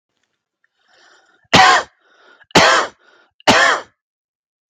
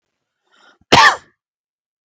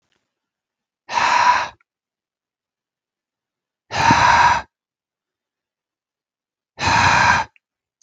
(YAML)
three_cough_length: 4.7 s
three_cough_amplitude: 32768
three_cough_signal_mean_std_ratio: 0.37
cough_length: 2.0 s
cough_amplitude: 32768
cough_signal_mean_std_ratio: 0.27
exhalation_length: 8.0 s
exhalation_amplitude: 30760
exhalation_signal_mean_std_ratio: 0.4
survey_phase: beta (2021-08-13 to 2022-03-07)
age: 18-44
gender: Male
wearing_mask: 'No'
symptom_none: true
smoker_status: Never smoked
respiratory_condition_asthma: false
respiratory_condition_other: false
recruitment_source: REACT
submission_delay: 2 days
covid_test_result: Negative
covid_test_method: RT-qPCR
influenza_a_test_result: Negative
influenza_b_test_result: Negative